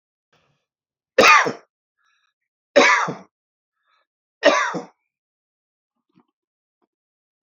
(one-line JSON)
{"three_cough_length": "7.4 s", "three_cough_amplitude": 28905, "three_cough_signal_mean_std_ratio": 0.27, "survey_phase": "alpha (2021-03-01 to 2021-08-12)", "age": "65+", "gender": "Male", "wearing_mask": "No", "symptom_none": true, "smoker_status": "Ex-smoker", "respiratory_condition_asthma": false, "respiratory_condition_other": false, "recruitment_source": "REACT", "submission_delay": "2 days", "covid_test_result": "Negative", "covid_test_method": "RT-qPCR"}